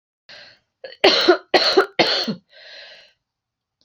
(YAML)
three_cough_length: 3.8 s
three_cough_amplitude: 31941
three_cough_signal_mean_std_ratio: 0.4
survey_phase: beta (2021-08-13 to 2022-03-07)
age: 18-44
gender: Female
wearing_mask: 'No'
symptom_runny_or_blocked_nose: true
symptom_change_to_sense_of_smell_or_taste: true
smoker_status: Never smoked
recruitment_source: Test and Trace
submission_delay: 2 days
covid_test_result: Positive
covid_test_method: RT-qPCR
covid_ct_value: 15.4
covid_ct_gene: ORF1ab gene
covid_ct_mean: 15.6
covid_viral_load: 7400000 copies/ml
covid_viral_load_category: High viral load (>1M copies/ml)